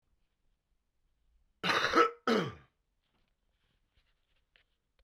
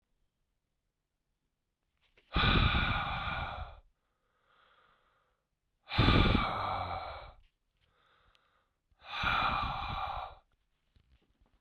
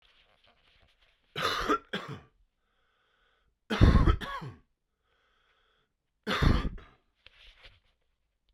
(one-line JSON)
{"cough_length": "5.0 s", "cough_amplitude": 7129, "cough_signal_mean_std_ratio": 0.28, "exhalation_length": "11.6 s", "exhalation_amplitude": 10123, "exhalation_signal_mean_std_ratio": 0.43, "three_cough_length": "8.5 s", "three_cough_amplitude": 15558, "three_cough_signal_mean_std_ratio": 0.3, "survey_phase": "beta (2021-08-13 to 2022-03-07)", "age": "18-44", "gender": "Male", "wearing_mask": "No", "symptom_cough_any": true, "symptom_new_continuous_cough": true, "symptom_runny_or_blocked_nose": true, "symptom_sore_throat": true, "symptom_fatigue": true, "symptom_fever_high_temperature": true, "symptom_headache": true, "symptom_loss_of_taste": true, "smoker_status": "Current smoker (1 to 10 cigarettes per day)", "respiratory_condition_asthma": false, "respiratory_condition_other": true, "recruitment_source": "Test and Trace", "submission_delay": "1 day", "covid_test_result": "Positive", "covid_test_method": "LFT"}